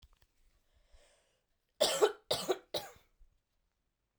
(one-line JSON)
{"cough_length": "4.2 s", "cough_amplitude": 5871, "cough_signal_mean_std_ratio": 0.28, "survey_phase": "alpha (2021-03-01 to 2021-08-12)", "age": "18-44", "gender": "Female", "wearing_mask": "No", "symptom_cough_any": true, "symptom_shortness_of_breath": true, "symptom_fatigue": true, "symptom_headache": true, "symptom_loss_of_taste": true, "symptom_onset": "3 days", "smoker_status": "Ex-smoker", "respiratory_condition_asthma": false, "respiratory_condition_other": false, "recruitment_source": "Test and Trace", "submission_delay": "2 days", "covid_test_result": "Positive", "covid_test_method": "RT-qPCR", "covid_ct_value": 16.7, "covid_ct_gene": "ORF1ab gene", "covid_ct_mean": 17.3, "covid_viral_load": "2100000 copies/ml", "covid_viral_load_category": "High viral load (>1M copies/ml)"}